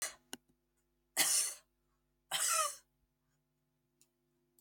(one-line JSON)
{"three_cough_length": "4.6 s", "three_cough_amplitude": 4783, "three_cough_signal_mean_std_ratio": 0.35, "survey_phase": "beta (2021-08-13 to 2022-03-07)", "age": "45-64", "gender": "Female", "wearing_mask": "No", "symptom_runny_or_blocked_nose": true, "symptom_fatigue": true, "symptom_headache": true, "symptom_onset": "4 days", "smoker_status": "Never smoked", "respiratory_condition_asthma": false, "respiratory_condition_other": false, "recruitment_source": "REACT", "submission_delay": "3 days", "covid_test_result": "Negative", "covid_test_method": "RT-qPCR", "influenza_a_test_result": "Negative", "influenza_b_test_result": "Negative"}